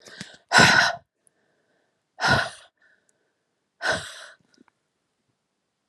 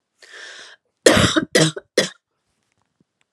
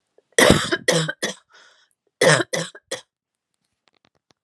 {"exhalation_length": "5.9 s", "exhalation_amplitude": 25837, "exhalation_signal_mean_std_ratio": 0.3, "cough_length": "3.3 s", "cough_amplitude": 32768, "cough_signal_mean_std_ratio": 0.34, "three_cough_length": "4.4 s", "three_cough_amplitude": 32768, "three_cough_signal_mean_std_ratio": 0.35, "survey_phase": "alpha (2021-03-01 to 2021-08-12)", "age": "45-64", "gender": "Female", "wearing_mask": "No", "symptom_cough_any": true, "symptom_fatigue": true, "symptom_headache": true, "smoker_status": "Never smoked", "respiratory_condition_asthma": false, "respiratory_condition_other": false, "recruitment_source": "Test and Trace", "submission_delay": "2 days", "covid_test_result": "Positive", "covid_test_method": "RT-qPCR", "covid_ct_value": 27.8, "covid_ct_gene": "ORF1ab gene", "covid_ct_mean": 27.9, "covid_viral_load": "690 copies/ml", "covid_viral_load_category": "Minimal viral load (< 10K copies/ml)"}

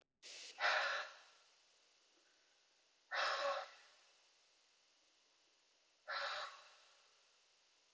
{"exhalation_length": "7.9 s", "exhalation_amplitude": 2084, "exhalation_signal_mean_std_ratio": 0.39, "survey_phase": "beta (2021-08-13 to 2022-03-07)", "age": "18-44", "gender": "Female", "wearing_mask": "No", "symptom_none": true, "smoker_status": "Never smoked", "respiratory_condition_asthma": false, "respiratory_condition_other": false, "recruitment_source": "REACT", "submission_delay": "1 day", "covid_test_result": "Negative", "covid_test_method": "RT-qPCR"}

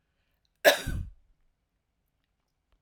{"cough_length": "2.8 s", "cough_amplitude": 17790, "cough_signal_mean_std_ratio": 0.22, "survey_phase": "alpha (2021-03-01 to 2021-08-12)", "age": "18-44", "gender": "Female", "wearing_mask": "No", "symptom_none": true, "smoker_status": "Ex-smoker", "respiratory_condition_asthma": false, "respiratory_condition_other": false, "recruitment_source": "REACT", "submission_delay": "5 days", "covid_test_result": "Negative", "covid_test_method": "RT-qPCR"}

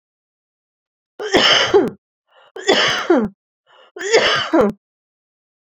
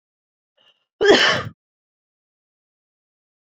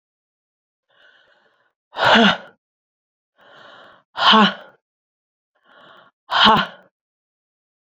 {"three_cough_length": "5.7 s", "three_cough_amplitude": 32342, "three_cough_signal_mean_std_ratio": 0.47, "cough_length": "3.5 s", "cough_amplitude": 27735, "cough_signal_mean_std_ratio": 0.27, "exhalation_length": "7.9 s", "exhalation_amplitude": 28815, "exhalation_signal_mean_std_ratio": 0.3, "survey_phase": "beta (2021-08-13 to 2022-03-07)", "age": "45-64", "gender": "Female", "wearing_mask": "No", "symptom_cough_any": true, "symptom_runny_or_blocked_nose": true, "symptom_shortness_of_breath": true, "symptom_sore_throat": true, "symptom_abdominal_pain": true, "symptom_fatigue": true, "symptom_fever_high_temperature": true, "symptom_headache": true, "symptom_change_to_sense_of_smell_or_taste": true, "smoker_status": "Ex-smoker", "respiratory_condition_asthma": false, "respiratory_condition_other": false, "recruitment_source": "Test and Trace", "submission_delay": "2 days", "covid_test_result": "Positive", "covid_test_method": "RT-qPCR"}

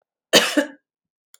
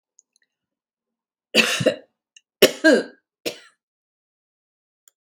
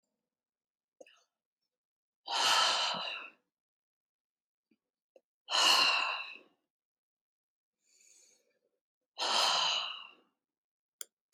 {"cough_length": "1.4 s", "cough_amplitude": 32767, "cough_signal_mean_std_ratio": 0.33, "three_cough_length": "5.3 s", "three_cough_amplitude": 32767, "three_cough_signal_mean_std_ratio": 0.25, "exhalation_length": "11.3 s", "exhalation_amplitude": 6896, "exhalation_signal_mean_std_ratio": 0.37, "survey_phase": "beta (2021-08-13 to 2022-03-07)", "age": "65+", "gender": "Female", "wearing_mask": "No", "symptom_none": true, "smoker_status": "Never smoked", "respiratory_condition_asthma": true, "respiratory_condition_other": false, "recruitment_source": "Test and Trace", "submission_delay": "1 day", "covid_test_result": "Negative", "covid_test_method": "RT-qPCR"}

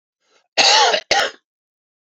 {"cough_length": "2.1 s", "cough_amplitude": 31236, "cough_signal_mean_std_ratio": 0.44, "survey_phase": "alpha (2021-03-01 to 2021-08-12)", "age": "65+", "gender": "Male", "wearing_mask": "No", "symptom_none": true, "smoker_status": "Ex-smoker", "respiratory_condition_asthma": false, "respiratory_condition_other": false, "recruitment_source": "REACT", "submission_delay": "1 day", "covid_test_result": "Negative", "covid_test_method": "RT-qPCR"}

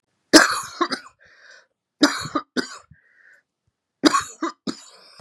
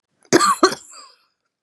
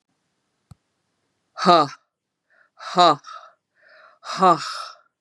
{"three_cough_length": "5.2 s", "three_cough_amplitude": 32768, "three_cough_signal_mean_std_ratio": 0.3, "cough_length": "1.6 s", "cough_amplitude": 31934, "cough_signal_mean_std_ratio": 0.36, "exhalation_length": "5.2 s", "exhalation_amplitude": 32745, "exhalation_signal_mean_std_ratio": 0.3, "survey_phase": "beta (2021-08-13 to 2022-03-07)", "age": "45-64", "gender": "Female", "wearing_mask": "No", "symptom_runny_or_blocked_nose": true, "symptom_other": true, "smoker_status": "Never smoked", "respiratory_condition_asthma": false, "respiratory_condition_other": false, "recruitment_source": "Test and Trace", "submission_delay": "2 days", "covid_test_result": "Positive", "covid_test_method": "RT-qPCR", "covid_ct_value": 17.8, "covid_ct_gene": "ORF1ab gene", "covid_ct_mean": 18.1, "covid_viral_load": "1100000 copies/ml", "covid_viral_load_category": "High viral load (>1M copies/ml)"}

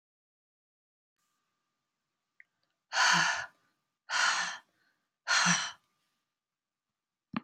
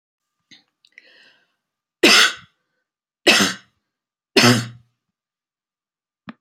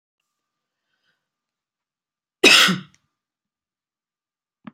{"exhalation_length": "7.4 s", "exhalation_amplitude": 7690, "exhalation_signal_mean_std_ratio": 0.34, "three_cough_length": "6.4 s", "three_cough_amplitude": 32241, "three_cough_signal_mean_std_ratio": 0.28, "cough_length": "4.7 s", "cough_amplitude": 31848, "cough_signal_mean_std_ratio": 0.21, "survey_phase": "beta (2021-08-13 to 2022-03-07)", "age": "65+", "gender": "Female", "wearing_mask": "No", "symptom_none": true, "smoker_status": "Never smoked", "respiratory_condition_asthma": false, "respiratory_condition_other": false, "recruitment_source": "REACT", "submission_delay": "3 days", "covid_test_result": "Negative", "covid_test_method": "RT-qPCR", "influenza_a_test_result": "Unknown/Void", "influenza_b_test_result": "Unknown/Void"}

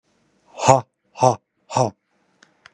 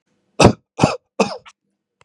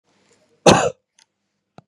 {"exhalation_length": "2.7 s", "exhalation_amplitude": 32768, "exhalation_signal_mean_std_ratio": 0.29, "three_cough_length": "2.0 s", "three_cough_amplitude": 32768, "three_cough_signal_mean_std_ratio": 0.3, "cough_length": "1.9 s", "cough_amplitude": 32768, "cough_signal_mean_std_ratio": 0.26, "survey_phase": "beta (2021-08-13 to 2022-03-07)", "age": "45-64", "gender": "Male", "wearing_mask": "No", "symptom_none": true, "smoker_status": "Never smoked", "respiratory_condition_asthma": false, "respiratory_condition_other": false, "recruitment_source": "REACT", "submission_delay": "2 days", "covid_test_result": "Negative", "covid_test_method": "RT-qPCR", "influenza_a_test_result": "Negative", "influenza_b_test_result": "Negative"}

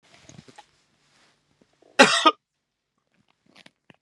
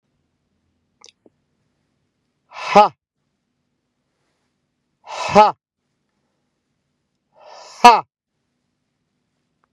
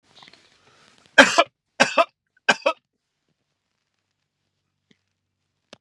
{"cough_length": "4.0 s", "cough_amplitude": 32302, "cough_signal_mean_std_ratio": 0.2, "exhalation_length": "9.7 s", "exhalation_amplitude": 32768, "exhalation_signal_mean_std_ratio": 0.19, "three_cough_length": "5.8 s", "three_cough_amplitude": 32768, "three_cough_signal_mean_std_ratio": 0.2, "survey_phase": "beta (2021-08-13 to 2022-03-07)", "age": "45-64", "gender": "Male", "wearing_mask": "No", "symptom_none": true, "smoker_status": "Ex-smoker", "respiratory_condition_asthma": true, "respiratory_condition_other": false, "recruitment_source": "REACT", "submission_delay": "1 day", "covid_test_result": "Negative", "covid_test_method": "RT-qPCR"}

